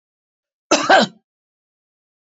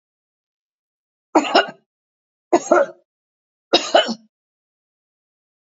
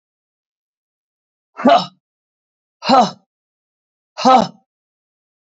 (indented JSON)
{
  "cough_length": "2.2 s",
  "cough_amplitude": 28695,
  "cough_signal_mean_std_ratio": 0.29,
  "three_cough_length": "5.7 s",
  "three_cough_amplitude": 29242,
  "three_cough_signal_mean_std_ratio": 0.28,
  "exhalation_length": "5.5 s",
  "exhalation_amplitude": 28878,
  "exhalation_signal_mean_std_ratio": 0.28,
  "survey_phase": "beta (2021-08-13 to 2022-03-07)",
  "age": "45-64",
  "gender": "Female",
  "wearing_mask": "No",
  "symptom_none": true,
  "smoker_status": "Never smoked",
  "respiratory_condition_asthma": false,
  "respiratory_condition_other": false,
  "recruitment_source": "REACT",
  "submission_delay": "2 days",
  "covid_test_result": "Negative",
  "covid_test_method": "RT-qPCR",
  "influenza_a_test_result": "Negative",
  "influenza_b_test_result": "Negative"
}